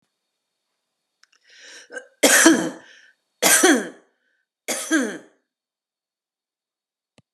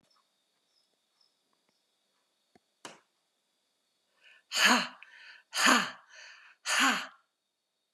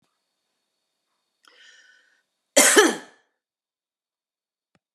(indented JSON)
{
  "three_cough_length": "7.3 s",
  "three_cough_amplitude": 32768,
  "three_cough_signal_mean_std_ratio": 0.32,
  "exhalation_length": "7.9 s",
  "exhalation_amplitude": 10928,
  "exhalation_signal_mean_std_ratio": 0.29,
  "cough_length": "4.9 s",
  "cough_amplitude": 31543,
  "cough_signal_mean_std_ratio": 0.22,
  "survey_phase": "alpha (2021-03-01 to 2021-08-12)",
  "age": "45-64",
  "gender": "Female",
  "wearing_mask": "No",
  "symptom_none": true,
  "smoker_status": "Never smoked",
  "respiratory_condition_asthma": false,
  "respiratory_condition_other": false,
  "recruitment_source": "REACT",
  "submission_delay": "2 days",
  "covid_test_result": "Negative",
  "covid_test_method": "RT-qPCR"
}